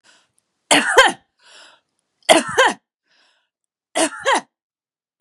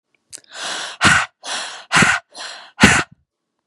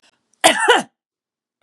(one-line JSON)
{"three_cough_length": "5.2 s", "three_cough_amplitude": 32768, "three_cough_signal_mean_std_ratio": 0.34, "exhalation_length": "3.7 s", "exhalation_amplitude": 32768, "exhalation_signal_mean_std_ratio": 0.44, "cough_length": "1.6 s", "cough_amplitude": 32767, "cough_signal_mean_std_ratio": 0.36, "survey_phase": "beta (2021-08-13 to 2022-03-07)", "age": "45-64", "gender": "Female", "wearing_mask": "No", "symptom_none": true, "smoker_status": "Ex-smoker", "respiratory_condition_asthma": false, "respiratory_condition_other": false, "recruitment_source": "REACT", "submission_delay": "2 days", "covid_test_result": "Negative", "covid_test_method": "RT-qPCR", "influenza_a_test_result": "Negative", "influenza_b_test_result": "Negative"}